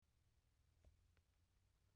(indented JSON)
{
  "cough_length": "2.0 s",
  "cough_amplitude": 31,
  "cough_signal_mean_std_ratio": 0.93,
  "survey_phase": "beta (2021-08-13 to 2022-03-07)",
  "age": "45-64",
  "gender": "Female",
  "wearing_mask": "No",
  "symptom_cough_any": true,
  "symptom_new_continuous_cough": true,
  "symptom_runny_or_blocked_nose": true,
  "symptom_shortness_of_breath": true,
  "symptom_abdominal_pain": true,
  "symptom_fatigue": true,
  "symptom_headache": true,
  "symptom_change_to_sense_of_smell_or_taste": true,
  "symptom_loss_of_taste": true,
  "symptom_onset": "4 days",
  "smoker_status": "Ex-smoker",
  "respiratory_condition_asthma": false,
  "respiratory_condition_other": false,
  "recruitment_source": "Test and Trace",
  "submission_delay": "1 day",
  "covid_test_result": "Positive",
  "covid_test_method": "RT-qPCR",
  "covid_ct_value": 16.7,
  "covid_ct_gene": "ORF1ab gene",
  "covid_ct_mean": 17.1,
  "covid_viral_load": "2600000 copies/ml",
  "covid_viral_load_category": "High viral load (>1M copies/ml)"
}